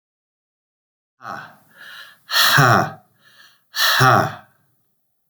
{"exhalation_length": "5.3 s", "exhalation_amplitude": 31304, "exhalation_signal_mean_std_ratio": 0.4, "survey_phase": "beta (2021-08-13 to 2022-03-07)", "age": "65+", "gender": "Male", "wearing_mask": "No", "symptom_cough_any": true, "symptom_sore_throat": true, "symptom_fatigue": true, "smoker_status": "Ex-smoker", "respiratory_condition_asthma": false, "respiratory_condition_other": false, "recruitment_source": "Test and Trace", "submission_delay": "1 day", "covid_test_result": "Positive", "covid_test_method": "RT-qPCR", "covid_ct_value": 24.3, "covid_ct_gene": "ORF1ab gene", "covid_ct_mean": 25.1, "covid_viral_load": "5900 copies/ml", "covid_viral_load_category": "Minimal viral load (< 10K copies/ml)"}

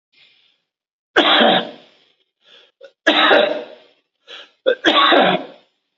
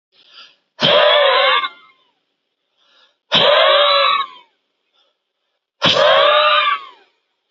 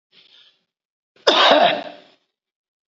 {"three_cough_length": "6.0 s", "three_cough_amplitude": 28659, "three_cough_signal_mean_std_ratio": 0.45, "exhalation_length": "7.5 s", "exhalation_amplitude": 31469, "exhalation_signal_mean_std_ratio": 0.55, "cough_length": "2.9 s", "cough_amplitude": 32767, "cough_signal_mean_std_ratio": 0.36, "survey_phase": "beta (2021-08-13 to 2022-03-07)", "age": "45-64", "gender": "Male", "wearing_mask": "No", "symptom_headache": true, "symptom_onset": "12 days", "smoker_status": "Current smoker (e-cigarettes or vapes only)", "respiratory_condition_asthma": false, "respiratory_condition_other": false, "recruitment_source": "REACT", "submission_delay": "2 days", "covid_test_result": "Negative", "covid_test_method": "RT-qPCR", "influenza_a_test_result": "Negative", "influenza_b_test_result": "Negative"}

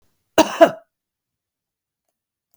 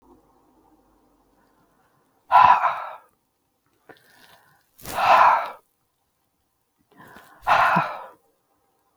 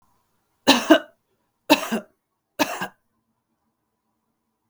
{"cough_length": "2.6 s", "cough_amplitude": 32766, "cough_signal_mean_std_ratio": 0.21, "exhalation_length": "9.0 s", "exhalation_amplitude": 29839, "exhalation_signal_mean_std_ratio": 0.32, "three_cough_length": "4.7 s", "three_cough_amplitude": 32768, "three_cough_signal_mean_std_ratio": 0.25, "survey_phase": "beta (2021-08-13 to 2022-03-07)", "age": "45-64", "gender": "Female", "wearing_mask": "No", "symptom_runny_or_blocked_nose": true, "symptom_shortness_of_breath": true, "symptom_sore_throat": true, "symptom_abdominal_pain": true, "symptom_fatigue": true, "symptom_fever_high_temperature": true, "symptom_headache": true, "symptom_other": true, "symptom_onset": "4 days", "smoker_status": "Ex-smoker", "respiratory_condition_asthma": false, "respiratory_condition_other": false, "recruitment_source": "Test and Trace", "submission_delay": "2 days", "covid_test_result": "Positive", "covid_test_method": "RT-qPCR", "covid_ct_value": 18.7, "covid_ct_gene": "ORF1ab gene"}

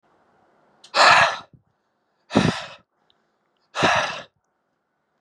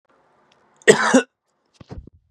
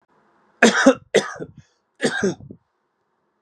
{"exhalation_length": "5.2 s", "exhalation_amplitude": 27342, "exhalation_signal_mean_std_ratio": 0.34, "cough_length": "2.3 s", "cough_amplitude": 32768, "cough_signal_mean_std_ratio": 0.28, "three_cough_length": "3.4 s", "three_cough_amplitude": 32591, "three_cough_signal_mean_std_ratio": 0.34, "survey_phase": "beta (2021-08-13 to 2022-03-07)", "age": "18-44", "gender": "Male", "wearing_mask": "No", "symptom_none": true, "smoker_status": "Ex-smoker", "respiratory_condition_asthma": false, "respiratory_condition_other": false, "recruitment_source": "REACT", "submission_delay": "4 days", "covid_test_result": "Negative", "covid_test_method": "RT-qPCR"}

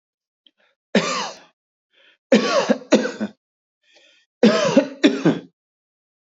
{"three_cough_length": "6.2 s", "three_cough_amplitude": 26691, "three_cough_signal_mean_std_ratio": 0.39, "survey_phase": "beta (2021-08-13 to 2022-03-07)", "age": "45-64", "gender": "Male", "wearing_mask": "No", "symptom_none": true, "smoker_status": "Never smoked", "respiratory_condition_asthma": false, "respiratory_condition_other": false, "recruitment_source": "REACT", "submission_delay": "3 days", "covid_test_result": "Negative", "covid_test_method": "RT-qPCR", "influenza_a_test_result": "Negative", "influenza_b_test_result": "Negative"}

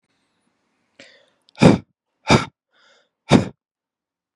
{"exhalation_length": "4.4 s", "exhalation_amplitude": 32768, "exhalation_signal_mean_std_ratio": 0.24, "survey_phase": "beta (2021-08-13 to 2022-03-07)", "age": "18-44", "gender": "Male", "wearing_mask": "No", "symptom_cough_any": true, "symptom_runny_or_blocked_nose": true, "symptom_sore_throat": true, "symptom_diarrhoea": true, "symptom_headache": true, "symptom_onset": "3 days", "smoker_status": "Ex-smoker", "respiratory_condition_asthma": false, "respiratory_condition_other": false, "recruitment_source": "Test and Trace", "submission_delay": "1 day", "covid_test_result": "Positive", "covid_test_method": "RT-qPCR", "covid_ct_value": 18.5, "covid_ct_gene": "N gene"}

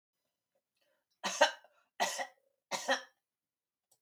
{"three_cough_length": "4.0 s", "three_cough_amplitude": 7778, "three_cough_signal_mean_std_ratio": 0.28, "survey_phase": "beta (2021-08-13 to 2022-03-07)", "age": "65+", "gender": "Female", "wearing_mask": "No", "symptom_cough_any": true, "smoker_status": "Never smoked", "respiratory_condition_asthma": false, "respiratory_condition_other": false, "recruitment_source": "REACT", "submission_delay": "3 days", "covid_test_result": "Negative", "covid_test_method": "RT-qPCR", "influenza_a_test_result": "Negative", "influenza_b_test_result": "Negative"}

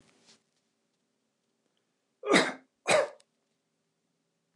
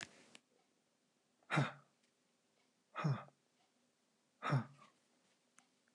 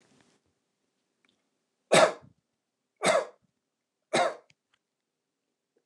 {"cough_length": "4.6 s", "cough_amplitude": 13857, "cough_signal_mean_std_ratio": 0.25, "exhalation_length": "5.9 s", "exhalation_amplitude": 2112, "exhalation_signal_mean_std_ratio": 0.28, "three_cough_length": "5.9 s", "three_cough_amplitude": 15054, "three_cough_signal_mean_std_ratio": 0.24, "survey_phase": "beta (2021-08-13 to 2022-03-07)", "age": "45-64", "gender": "Male", "wearing_mask": "No", "symptom_none": true, "smoker_status": "Never smoked", "respiratory_condition_asthma": false, "respiratory_condition_other": false, "recruitment_source": "REACT", "submission_delay": "2 days", "covid_test_result": "Negative", "covid_test_method": "RT-qPCR", "influenza_a_test_result": "Negative", "influenza_b_test_result": "Negative"}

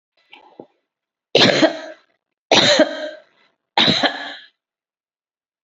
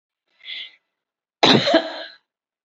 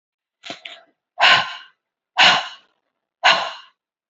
{"three_cough_length": "5.6 s", "three_cough_amplitude": 32768, "three_cough_signal_mean_std_ratio": 0.38, "cough_length": "2.6 s", "cough_amplitude": 29537, "cough_signal_mean_std_ratio": 0.34, "exhalation_length": "4.1 s", "exhalation_amplitude": 31165, "exhalation_signal_mean_std_ratio": 0.35, "survey_phase": "beta (2021-08-13 to 2022-03-07)", "age": "45-64", "gender": "Female", "wearing_mask": "No", "symptom_none": true, "symptom_onset": "5 days", "smoker_status": "Never smoked", "respiratory_condition_asthma": true, "respiratory_condition_other": false, "recruitment_source": "REACT", "submission_delay": "2 days", "covid_test_result": "Negative", "covid_test_method": "RT-qPCR"}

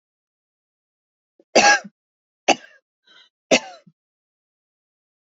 {"three_cough_length": "5.4 s", "three_cough_amplitude": 30023, "three_cough_signal_mean_std_ratio": 0.21, "survey_phase": "beta (2021-08-13 to 2022-03-07)", "age": "45-64", "gender": "Female", "wearing_mask": "No", "symptom_none": true, "symptom_onset": "8 days", "smoker_status": "Never smoked", "respiratory_condition_asthma": false, "respiratory_condition_other": false, "recruitment_source": "REACT", "submission_delay": "1 day", "covid_test_result": "Negative", "covid_test_method": "RT-qPCR", "influenza_a_test_result": "Unknown/Void", "influenza_b_test_result": "Unknown/Void"}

